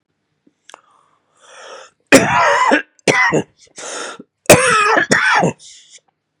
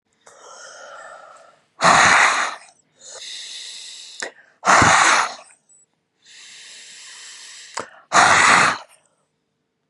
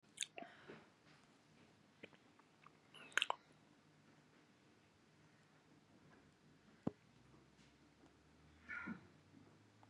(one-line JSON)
{"three_cough_length": "6.4 s", "three_cough_amplitude": 32768, "three_cough_signal_mean_std_ratio": 0.48, "exhalation_length": "9.9 s", "exhalation_amplitude": 32627, "exhalation_signal_mean_std_ratio": 0.41, "cough_length": "9.9 s", "cough_amplitude": 4873, "cough_signal_mean_std_ratio": 0.27, "survey_phase": "beta (2021-08-13 to 2022-03-07)", "age": "65+", "gender": "Male", "wearing_mask": "No", "symptom_cough_any": true, "symptom_fever_high_temperature": true, "symptom_onset": "4 days", "smoker_status": "Never smoked", "respiratory_condition_asthma": false, "respiratory_condition_other": true, "recruitment_source": "Test and Trace", "submission_delay": "2 days", "covid_test_result": "Positive", "covid_test_method": "RT-qPCR", "covid_ct_value": 20.5, "covid_ct_gene": "ORF1ab gene", "covid_ct_mean": 20.9, "covid_viral_load": "140000 copies/ml", "covid_viral_load_category": "Low viral load (10K-1M copies/ml)"}